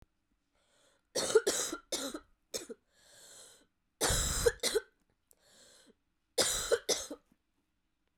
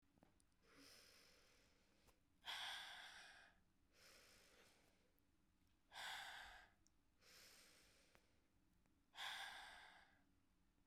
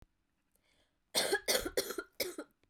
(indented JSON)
{
  "three_cough_length": "8.2 s",
  "three_cough_amplitude": 6832,
  "three_cough_signal_mean_std_ratio": 0.38,
  "exhalation_length": "10.9 s",
  "exhalation_amplitude": 322,
  "exhalation_signal_mean_std_ratio": 0.52,
  "cough_length": "2.7 s",
  "cough_amplitude": 4790,
  "cough_signal_mean_std_ratio": 0.42,
  "survey_phase": "beta (2021-08-13 to 2022-03-07)",
  "age": "18-44",
  "gender": "Female",
  "wearing_mask": "No",
  "symptom_cough_any": true,
  "symptom_runny_or_blocked_nose": true,
  "symptom_sore_throat": true,
  "symptom_abdominal_pain": true,
  "symptom_fatigue": true,
  "symptom_headache": true,
  "smoker_status": "Never smoked",
  "respiratory_condition_asthma": false,
  "respiratory_condition_other": false,
  "recruitment_source": "Test and Trace",
  "submission_delay": "1 day",
  "covid_test_result": "Positive",
  "covid_test_method": "RT-qPCR",
  "covid_ct_value": 23.4,
  "covid_ct_gene": "ORF1ab gene",
  "covid_ct_mean": 24.0,
  "covid_viral_load": "14000 copies/ml",
  "covid_viral_load_category": "Low viral load (10K-1M copies/ml)"
}